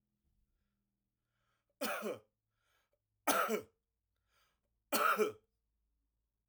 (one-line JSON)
{"three_cough_length": "6.5 s", "three_cough_amplitude": 4344, "three_cough_signal_mean_std_ratio": 0.31, "survey_phase": "alpha (2021-03-01 to 2021-08-12)", "age": "45-64", "gender": "Male", "wearing_mask": "No", "symptom_none": true, "symptom_onset": "6 days", "smoker_status": "Never smoked", "respiratory_condition_asthma": true, "respiratory_condition_other": false, "recruitment_source": "REACT", "submission_delay": "3 days", "covid_test_result": "Negative", "covid_test_method": "RT-qPCR"}